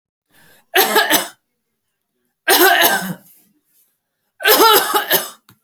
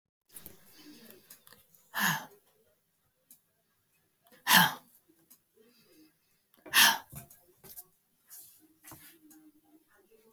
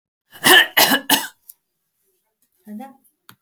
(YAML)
three_cough_length: 5.6 s
three_cough_amplitude: 32768
three_cough_signal_mean_std_ratio: 0.47
exhalation_length: 10.3 s
exhalation_amplitude: 12077
exhalation_signal_mean_std_ratio: 0.23
cough_length: 3.4 s
cough_amplitude: 32768
cough_signal_mean_std_ratio: 0.33
survey_phase: beta (2021-08-13 to 2022-03-07)
age: 65+
gender: Female
wearing_mask: 'No'
symptom_cough_any: true
symptom_runny_or_blocked_nose: true
symptom_onset: 11 days
smoker_status: Never smoked
respiratory_condition_asthma: false
respiratory_condition_other: false
recruitment_source: REACT
submission_delay: 1 day
covid_test_result: Positive
covid_test_method: RT-qPCR
covid_ct_value: 29.9
covid_ct_gene: E gene
influenza_a_test_result: Negative
influenza_b_test_result: Negative